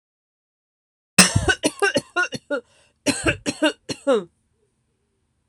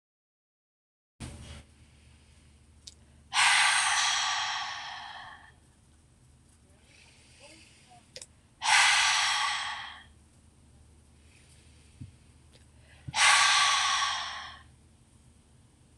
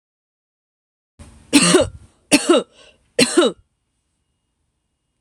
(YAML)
cough_length: 5.5 s
cough_amplitude: 26028
cough_signal_mean_std_ratio: 0.38
exhalation_length: 16.0 s
exhalation_amplitude: 11665
exhalation_signal_mean_std_ratio: 0.43
three_cough_length: 5.2 s
three_cough_amplitude: 26028
three_cough_signal_mean_std_ratio: 0.33
survey_phase: alpha (2021-03-01 to 2021-08-12)
age: 18-44
gender: Female
wearing_mask: 'No'
symptom_cough_any: true
symptom_fatigue: true
symptom_headache: true
symptom_change_to_sense_of_smell_or_taste: true
symptom_onset: 3 days
smoker_status: Never smoked
respiratory_condition_asthma: false
respiratory_condition_other: false
recruitment_source: Test and Trace
submission_delay: 2 days
covid_test_result: Positive
covid_test_method: RT-qPCR
covid_ct_value: 26.9
covid_ct_gene: N gene